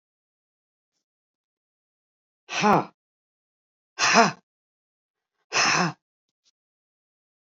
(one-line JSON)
{"exhalation_length": "7.6 s", "exhalation_amplitude": 26309, "exhalation_signal_mean_std_ratio": 0.27, "survey_phase": "beta (2021-08-13 to 2022-03-07)", "age": "65+", "gender": "Female", "wearing_mask": "No", "symptom_none": true, "smoker_status": "Ex-smoker", "respiratory_condition_asthma": false, "respiratory_condition_other": false, "recruitment_source": "REACT", "submission_delay": "1 day", "covid_test_result": "Negative", "covid_test_method": "RT-qPCR"}